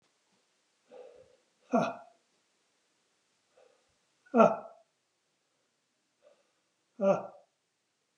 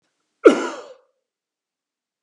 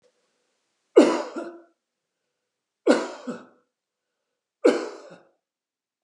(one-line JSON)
{"exhalation_length": "8.2 s", "exhalation_amplitude": 11349, "exhalation_signal_mean_std_ratio": 0.22, "cough_length": "2.2 s", "cough_amplitude": 32768, "cough_signal_mean_std_ratio": 0.21, "three_cough_length": "6.0 s", "three_cough_amplitude": 25455, "three_cough_signal_mean_std_ratio": 0.26, "survey_phase": "beta (2021-08-13 to 2022-03-07)", "age": "45-64", "gender": "Male", "wearing_mask": "No", "symptom_none": true, "smoker_status": "Never smoked", "respiratory_condition_asthma": false, "respiratory_condition_other": false, "recruitment_source": "REACT", "submission_delay": "2 days", "covid_test_result": "Negative", "covid_test_method": "RT-qPCR", "influenza_a_test_result": "Negative", "influenza_b_test_result": "Negative"}